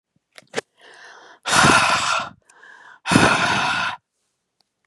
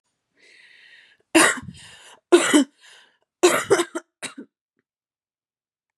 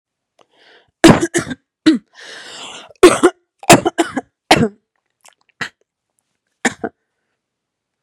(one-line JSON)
{"exhalation_length": "4.9 s", "exhalation_amplitude": 32357, "exhalation_signal_mean_std_ratio": 0.49, "three_cough_length": "6.0 s", "three_cough_amplitude": 30325, "three_cough_signal_mean_std_ratio": 0.31, "cough_length": "8.0 s", "cough_amplitude": 32768, "cough_signal_mean_std_ratio": 0.29, "survey_phase": "beta (2021-08-13 to 2022-03-07)", "age": "18-44", "gender": "Female", "wearing_mask": "No", "symptom_cough_any": true, "symptom_runny_or_blocked_nose": true, "symptom_sore_throat": true, "symptom_fatigue": true, "symptom_other": true, "smoker_status": "Never smoked", "respiratory_condition_asthma": false, "respiratory_condition_other": false, "recruitment_source": "Test and Trace", "submission_delay": "2 days", "covid_test_result": "Positive", "covid_test_method": "RT-qPCR", "covid_ct_value": 23.8, "covid_ct_gene": "ORF1ab gene", "covid_ct_mean": 24.3, "covid_viral_load": "11000 copies/ml", "covid_viral_load_category": "Low viral load (10K-1M copies/ml)"}